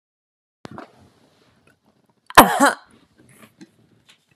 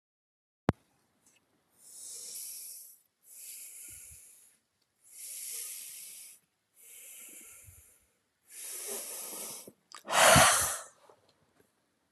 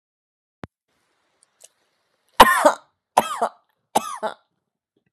{"cough_length": "4.4 s", "cough_amplitude": 32768, "cough_signal_mean_std_ratio": 0.2, "exhalation_length": "12.1 s", "exhalation_amplitude": 12097, "exhalation_signal_mean_std_ratio": 0.29, "three_cough_length": "5.1 s", "three_cough_amplitude": 32768, "three_cough_signal_mean_std_ratio": 0.23, "survey_phase": "beta (2021-08-13 to 2022-03-07)", "age": "18-44", "gender": "Female", "wearing_mask": "No", "symptom_cough_any": true, "symptom_fatigue": true, "symptom_fever_high_temperature": true, "symptom_headache": true, "symptom_onset": "4 days", "smoker_status": "Never smoked", "respiratory_condition_asthma": false, "respiratory_condition_other": false, "recruitment_source": "Test and Trace", "submission_delay": "2 days", "covid_test_result": "Positive", "covid_test_method": "RT-qPCR", "covid_ct_value": 27.4, "covid_ct_gene": "ORF1ab gene"}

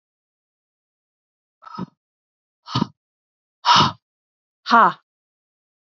{"exhalation_length": "5.8 s", "exhalation_amplitude": 30196, "exhalation_signal_mean_std_ratio": 0.24, "survey_phase": "beta (2021-08-13 to 2022-03-07)", "age": "45-64", "gender": "Female", "wearing_mask": "No", "symptom_none": true, "smoker_status": "Never smoked", "respiratory_condition_asthma": false, "respiratory_condition_other": false, "recruitment_source": "REACT", "submission_delay": "2 days", "covid_test_result": "Negative", "covid_test_method": "RT-qPCR", "influenza_a_test_result": "Negative", "influenza_b_test_result": "Negative"}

